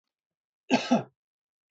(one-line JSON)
{"cough_length": "1.7 s", "cough_amplitude": 9876, "cough_signal_mean_std_ratio": 0.29, "survey_phase": "beta (2021-08-13 to 2022-03-07)", "age": "45-64", "gender": "Male", "wearing_mask": "No", "symptom_none": true, "smoker_status": "Never smoked", "respiratory_condition_asthma": false, "respiratory_condition_other": false, "recruitment_source": "REACT", "submission_delay": "1 day", "covid_test_result": "Negative", "covid_test_method": "RT-qPCR"}